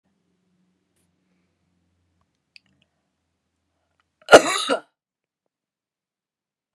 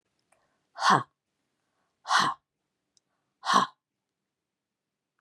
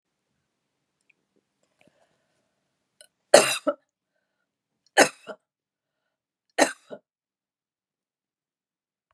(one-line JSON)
{"cough_length": "6.7 s", "cough_amplitude": 32768, "cough_signal_mean_std_ratio": 0.14, "exhalation_length": "5.2 s", "exhalation_amplitude": 16563, "exhalation_signal_mean_std_ratio": 0.27, "three_cough_length": "9.1 s", "three_cough_amplitude": 32736, "three_cough_signal_mean_std_ratio": 0.16, "survey_phase": "beta (2021-08-13 to 2022-03-07)", "age": "65+", "gender": "Female", "wearing_mask": "No", "symptom_none": true, "smoker_status": "Ex-smoker", "respiratory_condition_asthma": false, "respiratory_condition_other": false, "recruitment_source": "REACT", "submission_delay": "2 days", "covid_test_result": "Negative", "covid_test_method": "RT-qPCR", "influenza_a_test_result": "Negative", "influenza_b_test_result": "Negative"}